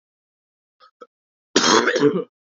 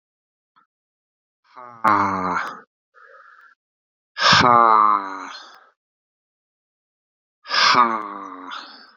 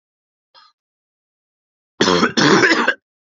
{
  "cough_length": "2.5 s",
  "cough_amplitude": 27496,
  "cough_signal_mean_std_ratio": 0.4,
  "exhalation_length": "9.0 s",
  "exhalation_amplitude": 29575,
  "exhalation_signal_mean_std_ratio": 0.38,
  "three_cough_length": "3.2 s",
  "three_cough_amplitude": 29177,
  "three_cough_signal_mean_std_ratio": 0.41,
  "survey_phase": "beta (2021-08-13 to 2022-03-07)",
  "age": "18-44",
  "gender": "Male",
  "wearing_mask": "No",
  "symptom_cough_any": true,
  "symptom_runny_or_blocked_nose": true,
  "symptom_diarrhoea": true,
  "smoker_status": "Never smoked",
  "respiratory_condition_asthma": false,
  "respiratory_condition_other": false,
  "recruitment_source": "Test and Trace",
  "submission_delay": "4 days",
  "covid_test_result": "Positive",
  "covid_test_method": "RT-qPCR",
  "covid_ct_value": 24.3,
  "covid_ct_gene": "ORF1ab gene",
  "covid_ct_mean": 25.1,
  "covid_viral_load": "6000 copies/ml",
  "covid_viral_load_category": "Minimal viral load (< 10K copies/ml)"
}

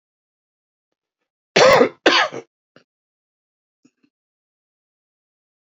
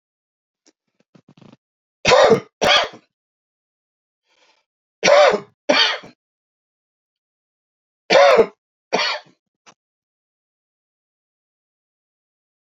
{
  "cough_length": "5.7 s",
  "cough_amplitude": 29108,
  "cough_signal_mean_std_ratio": 0.25,
  "three_cough_length": "12.7 s",
  "three_cough_amplitude": 28940,
  "three_cough_signal_mean_std_ratio": 0.3,
  "survey_phase": "beta (2021-08-13 to 2022-03-07)",
  "age": "65+",
  "gender": "Male",
  "wearing_mask": "No",
  "symptom_cough_any": true,
  "symptom_runny_or_blocked_nose": true,
  "symptom_shortness_of_breath": true,
  "symptom_onset": "12 days",
  "smoker_status": "Never smoked",
  "respiratory_condition_asthma": false,
  "respiratory_condition_other": true,
  "recruitment_source": "REACT",
  "submission_delay": "1 day",
  "covid_test_result": "Negative",
  "covid_test_method": "RT-qPCR",
  "influenza_a_test_result": "Negative",
  "influenza_b_test_result": "Negative"
}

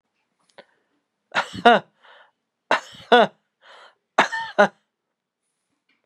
{
  "three_cough_length": "6.1 s",
  "three_cough_amplitude": 32585,
  "three_cough_signal_mean_std_ratio": 0.26,
  "survey_phase": "beta (2021-08-13 to 2022-03-07)",
  "age": "45-64",
  "gender": "Male",
  "wearing_mask": "No",
  "symptom_cough_any": true,
  "symptom_runny_or_blocked_nose": true,
  "symptom_sore_throat": true,
  "symptom_fatigue": true,
  "symptom_onset": "5 days",
  "smoker_status": "Never smoked",
  "respiratory_condition_asthma": false,
  "respiratory_condition_other": false,
  "recruitment_source": "REACT",
  "submission_delay": "1 day",
  "covid_test_result": "Negative",
  "covid_test_method": "RT-qPCR",
  "influenza_a_test_result": "Negative",
  "influenza_b_test_result": "Negative"
}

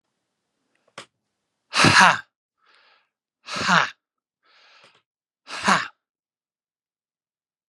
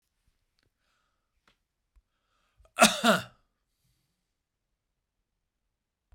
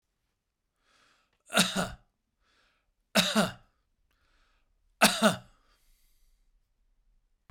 {
  "exhalation_length": "7.7 s",
  "exhalation_amplitude": 32767,
  "exhalation_signal_mean_std_ratio": 0.26,
  "cough_length": "6.1 s",
  "cough_amplitude": 18378,
  "cough_signal_mean_std_ratio": 0.17,
  "three_cough_length": "7.5 s",
  "three_cough_amplitude": 16721,
  "three_cough_signal_mean_std_ratio": 0.26,
  "survey_phase": "beta (2021-08-13 to 2022-03-07)",
  "age": "45-64",
  "gender": "Male",
  "wearing_mask": "No",
  "symptom_none": true,
  "smoker_status": "Ex-smoker",
  "respiratory_condition_asthma": false,
  "respiratory_condition_other": false,
  "recruitment_source": "REACT",
  "submission_delay": "-1 day",
  "covid_test_result": "Negative",
  "covid_test_method": "RT-qPCR"
}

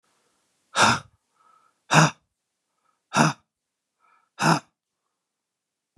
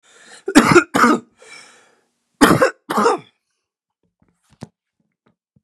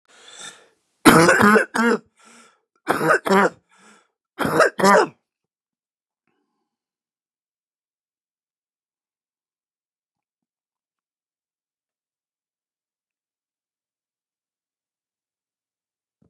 {
  "exhalation_length": "6.0 s",
  "exhalation_amplitude": 27151,
  "exhalation_signal_mean_std_ratio": 0.28,
  "cough_length": "5.6 s",
  "cough_amplitude": 32768,
  "cough_signal_mean_std_ratio": 0.34,
  "three_cough_length": "16.3 s",
  "three_cough_amplitude": 32767,
  "three_cough_signal_mean_std_ratio": 0.26,
  "survey_phase": "beta (2021-08-13 to 2022-03-07)",
  "age": "45-64",
  "gender": "Male",
  "wearing_mask": "No",
  "symptom_cough_any": true,
  "symptom_fatigue": true,
  "smoker_status": "Never smoked",
  "respiratory_condition_asthma": false,
  "respiratory_condition_other": false,
  "recruitment_source": "Test and Trace",
  "submission_delay": "1 day",
  "covid_test_result": "Negative",
  "covid_test_method": "RT-qPCR"
}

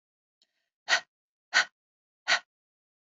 {
  "exhalation_length": "3.2 s",
  "exhalation_amplitude": 15155,
  "exhalation_signal_mean_std_ratio": 0.23,
  "survey_phase": "beta (2021-08-13 to 2022-03-07)",
  "age": "18-44",
  "gender": "Female",
  "wearing_mask": "No",
  "symptom_none": true,
  "smoker_status": "Never smoked",
  "respiratory_condition_asthma": false,
  "respiratory_condition_other": false,
  "recruitment_source": "REACT",
  "submission_delay": "1 day",
  "covid_test_result": "Negative",
  "covid_test_method": "RT-qPCR"
}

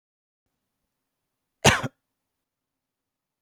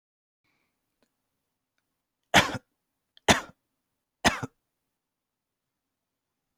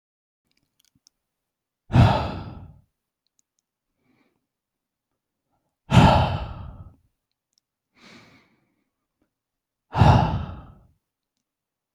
{
  "cough_length": "3.4 s",
  "cough_amplitude": 28100,
  "cough_signal_mean_std_ratio": 0.16,
  "three_cough_length": "6.6 s",
  "three_cough_amplitude": 27495,
  "three_cough_signal_mean_std_ratio": 0.17,
  "exhalation_length": "11.9 s",
  "exhalation_amplitude": 25587,
  "exhalation_signal_mean_std_ratio": 0.27,
  "survey_phase": "beta (2021-08-13 to 2022-03-07)",
  "age": "18-44",
  "gender": "Male",
  "wearing_mask": "No",
  "symptom_none": true,
  "smoker_status": "Never smoked",
  "respiratory_condition_asthma": false,
  "respiratory_condition_other": false,
  "recruitment_source": "REACT",
  "submission_delay": "1 day",
  "covid_test_result": "Negative",
  "covid_test_method": "RT-qPCR",
  "influenza_a_test_result": "Unknown/Void",
  "influenza_b_test_result": "Unknown/Void"
}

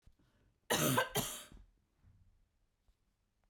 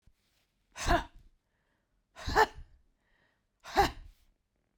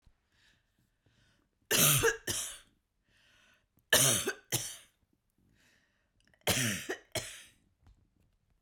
{
  "cough_length": "3.5 s",
  "cough_amplitude": 4609,
  "cough_signal_mean_std_ratio": 0.34,
  "exhalation_length": "4.8 s",
  "exhalation_amplitude": 8749,
  "exhalation_signal_mean_std_ratio": 0.28,
  "three_cough_length": "8.6 s",
  "three_cough_amplitude": 10542,
  "three_cough_signal_mean_std_ratio": 0.35,
  "survey_phase": "beta (2021-08-13 to 2022-03-07)",
  "age": "45-64",
  "gender": "Female",
  "wearing_mask": "No",
  "symptom_runny_or_blocked_nose": true,
  "symptom_headache": true,
  "symptom_onset": "12 days",
  "smoker_status": "Never smoked",
  "respiratory_condition_asthma": false,
  "respiratory_condition_other": false,
  "recruitment_source": "REACT",
  "submission_delay": "6 days",
  "covid_test_result": "Negative",
  "covid_test_method": "RT-qPCR",
  "influenza_a_test_result": "Negative",
  "influenza_b_test_result": "Negative"
}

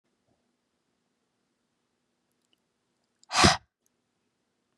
{
  "exhalation_length": "4.8 s",
  "exhalation_amplitude": 19951,
  "exhalation_signal_mean_std_ratio": 0.16,
  "survey_phase": "beta (2021-08-13 to 2022-03-07)",
  "age": "18-44",
  "gender": "Female",
  "wearing_mask": "No",
  "symptom_cough_any": true,
  "symptom_runny_or_blocked_nose": true,
  "symptom_onset": "12 days",
  "smoker_status": "Never smoked",
  "respiratory_condition_asthma": false,
  "respiratory_condition_other": false,
  "recruitment_source": "REACT",
  "submission_delay": "1 day",
  "covid_test_result": "Negative",
  "covid_test_method": "RT-qPCR",
  "influenza_a_test_result": "Negative",
  "influenza_b_test_result": "Negative"
}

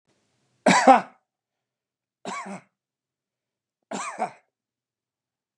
{
  "three_cough_length": "5.6 s",
  "three_cough_amplitude": 25987,
  "three_cough_signal_mean_std_ratio": 0.23,
  "survey_phase": "beta (2021-08-13 to 2022-03-07)",
  "age": "65+",
  "gender": "Male",
  "wearing_mask": "No",
  "symptom_none": true,
  "smoker_status": "Ex-smoker",
  "respiratory_condition_asthma": false,
  "respiratory_condition_other": false,
  "recruitment_source": "REACT",
  "submission_delay": "2 days",
  "covid_test_result": "Negative",
  "covid_test_method": "RT-qPCR",
  "influenza_a_test_result": "Negative",
  "influenza_b_test_result": "Negative"
}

